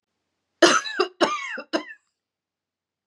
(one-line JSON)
{"three_cough_length": "3.1 s", "three_cough_amplitude": 26479, "three_cough_signal_mean_std_ratio": 0.35, "survey_phase": "beta (2021-08-13 to 2022-03-07)", "age": "18-44", "gender": "Female", "wearing_mask": "No", "symptom_new_continuous_cough": true, "symptom_runny_or_blocked_nose": true, "symptom_shortness_of_breath": true, "symptom_fatigue": true, "symptom_headache": true, "symptom_onset": "3 days", "smoker_status": "Never smoked", "respiratory_condition_asthma": false, "respiratory_condition_other": false, "recruitment_source": "REACT", "submission_delay": "1 day", "covid_test_result": "Positive", "covid_test_method": "RT-qPCR", "covid_ct_value": 22.6, "covid_ct_gene": "E gene", "influenza_a_test_result": "Negative", "influenza_b_test_result": "Negative"}